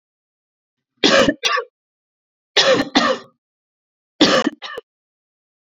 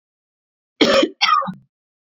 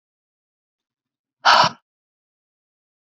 {
  "three_cough_length": "5.6 s",
  "three_cough_amplitude": 30928,
  "three_cough_signal_mean_std_ratio": 0.38,
  "cough_length": "2.1 s",
  "cough_amplitude": 28310,
  "cough_signal_mean_std_ratio": 0.42,
  "exhalation_length": "3.2 s",
  "exhalation_amplitude": 32767,
  "exhalation_signal_mean_std_ratio": 0.22,
  "survey_phase": "beta (2021-08-13 to 2022-03-07)",
  "age": "45-64",
  "gender": "Female",
  "wearing_mask": "No",
  "symptom_none": true,
  "smoker_status": "Ex-smoker",
  "respiratory_condition_asthma": false,
  "respiratory_condition_other": false,
  "recruitment_source": "REACT",
  "submission_delay": "0 days",
  "covid_test_result": "Negative",
  "covid_test_method": "RT-qPCR"
}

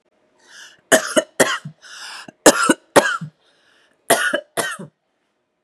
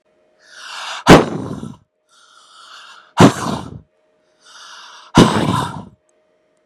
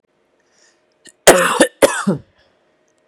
{
  "three_cough_length": "5.6 s",
  "three_cough_amplitude": 32768,
  "three_cough_signal_mean_std_ratio": 0.35,
  "exhalation_length": "6.7 s",
  "exhalation_amplitude": 32768,
  "exhalation_signal_mean_std_ratio": 0.32,
  "cough_length": "3.1 s",
  "cough_amplitude": 32768,
  "cough_signal_mean_std_ratio": 0.33,
  "survey_phase": "beta (2021-08-13 to 2022-03-07)",
  "age": "18-44",
  "gender": "Female",
  "wearing_mask": "No",
  "symptom_none": true,
  "symptom_onset": "4 days",
  "smoker_status": "Ex-smoker",
  "respiratory_condition_asthma": false,
  "respiratory_condition_other": false,
  "recruitment_source": "REACT",
  "submission_delay": "2 days",
  "covid_test_result": "Negative",
  "covid_test_method": "RT-qPCR",
  "influenza_a_test_result": "Negative",
  "influenza_b_test_result": "Negative"
}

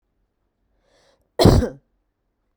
{
  "cough_length": "2.6 s",
  "cough_amplitude": 32768,
  "cough_signal_mean_std_ratio": 0.25,
  "survey_phase": "beta (2021-08-13 to 2022-03-07)",
  "age": "18-44",
  "gender": "Female",
  "wearing_mask": "No",
  "symptom_sore_throat": true,
  "symptom_headache": true,
  "smoker_status": "Never smoked",
  "respiratory_condition_asthma": false,
  "respiratory_condition_other": false,
  "recruitment_source": "REACT",
  "submission_delay": "3 days",
  "covid_test_result": "Negative",
  "covid_test_method": "RT-qPCR"
}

